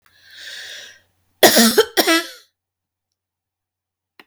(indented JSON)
{
  "cough_length": "4.3 s",
  "cough_amplitude": 32768,
  "cough_signal_mean_std_ratio": 0.32,
  "survey_phase": "beta (2021-08-13 to 2022-03-07)",
  "age": "45-64",
  "gender": "Female",
  "wearing_mask": "No",
  "symptom_cough_any": true,
  "symptom_sore_throat": true,
  "symptom_fever_high_temperature": true,
  "symptom_onset": "12 days",
  "smoker_status": "Never smoked",
  "respiratory_condition_asthma": false,
  "respiratory_condition_other": false,
  "recruitment_source": "REACT",
  "submission_delay": "1 day",
  "covid_test_result": "Negative",
  "covid_test_method": "RT-qPCR"
}